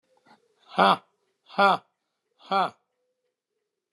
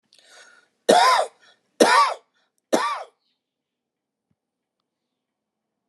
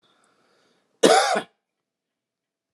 exhalation_length: 3.9 s
exhalation_amplitude: 19206
exhalation_signal_mean_std_ratio: 0.27
three_cough_length: 5.9 s
three_cough_amplitude: 29164
three_cough_signal_mean_std_ratio: 0.31
cough_length: 2.7 s
cough_amplitude: 28080
cough_signal_mean_std_ratio: 0.28
survey_phase: alpha (2021-03-01 to 2021-08-12)
age: 65+
gender: Male
wearing_mask: 'No'
symptom_none: true
smoker_status: Never smoked
respiratory_condition_asthma: false
respiratory_condition_other: false
recruitment_source: REACT
submission_delay: 1 day
covid_test_result: Negative
covid_test_method: RT-qPCR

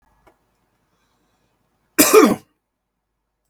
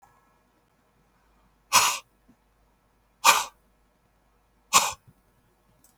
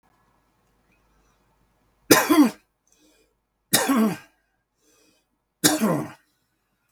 cough_length: 3.5 s
cough_amplitude: 32768
cough_signal_mean_std_ratio: 0.24
exhalation_length: 6.0 s
exhalation_amplitude: 27135
exhalation_signal_mean_std_ratio: 0.24
three_cough_length: 6.9 s
three_cough_amplitude: 32768
three_cough_signal_mean_std_ratio: 0.32
survey_phase: beta (2021-08-13 to 2022-03-07)
age: 45-64
gender: Male
wearing_mask: 'No'
symptom_runny_or_blocked_nose: true
symptom_fatigue: true
symptom_change_to_sense_of_smell_or_taste: true
symptom_loss_of_taste: true
symptom_onset: 4 days
smoker_status: Current smoker (e-cigarettes or vapes only)
respiratory_condition_asthma: false
respiratory_condition_other: false
recruitment_source: Test and Trace
submission_delay: 1 day
covid_test_result: Positive
covid_test_method: RT-qPCR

